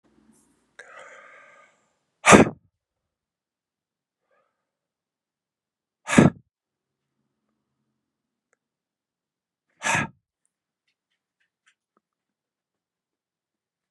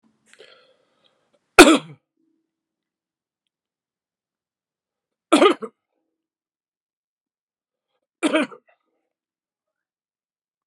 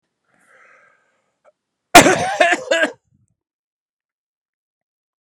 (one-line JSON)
{"exhalation_length": "13.9 s", "exhalation_amplitude": 32767, "exhalation_signal_mean_std_ratio": 0.15, "three_cough_length": "10.7 s", "three_cough_amplitude": 32768, "three_cough_signal_mean_std_ratio": 0.17, "cough_length": "5.2 s", "cough_amplitude": 32768, "cough_signal_mean_std_ratio": 0.26, "survey_phase": "beta (2021-08-13 to 2022-03-07)", "age": "45-64", "gender": "Male", "wearing_mask": "No", "symptom_cough_any": true, "symptom_runny_or_blocked_nose": true, "symptom_headache": true, "smoker_status": "Never smoked", "respiratory_condition_asthma": false, "respiratory_condition_other": false, "recruitment_source": "Test and Trace", "submission_delay": "1 day", "covid_test_result": "Positive", "covid_test_method": "RT-qPCR", "covid_ct_value": 16.7, "covid_ct_gene": "ORF1ab gene", "covid_ct_mean": 17.3, "covid_viral_load": "2200000 copies/ml", "covid_viral_load_category": "High viral load (>1M copies/ml)"}